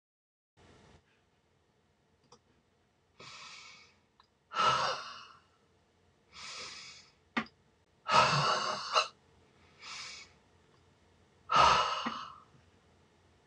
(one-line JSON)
{"exhalation_length": "13.5 s", "exhalation_amplitude": 9144, "exhalation_signal_mean_std_ratio": 0.34, "survey_phase": "beta (2021-08-13 to 2022-03-07)", "age": "65+", "gender": "Female", "wearing_mask": "No", "symptom_cough_any": true, "smoker_status": "Ex-smoker", "respiratory_condition_asthma": false, "respiratory_condition_other": false, "recruitment_source": "REACT", "submission_delay": "4 days", "covid_test_result": "Negative", "covid_test_method": "RT-qPCR"}